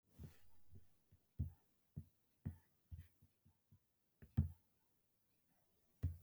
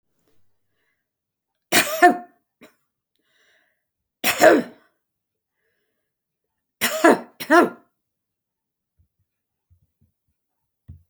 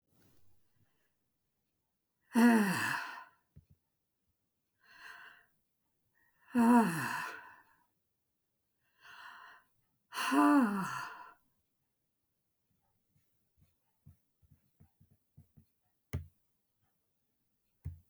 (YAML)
cough_length: 6.2 s
cough_amplitude: 1936
cough_signal_mean_std_ratio: 0.28
three_cough_length: 11.1 s
three_cough_amplitude: 29036
three_cough_signal_mean_std_ratio: 0.24
exhalation_length: 18.1 s
exhalation_amplitude: 5373
exhalation_signal_mean_std_ratio: 0.29
survey_phase: beta (2021-08-13 to 2022-03-07)
age: 65+
gender: Female
wearing_mask: 'No'
symptom_runny_or_blocked_nose: true
symptom_shortness_of_breath: true
smoker_status: Never smoked
respiratory_condition_asthma: false
respiratory_condition_other: false
recruitment_source: REACT
submission_delay: 2 days
covid_test_result: Negative
covid_test_method: RT-qPCR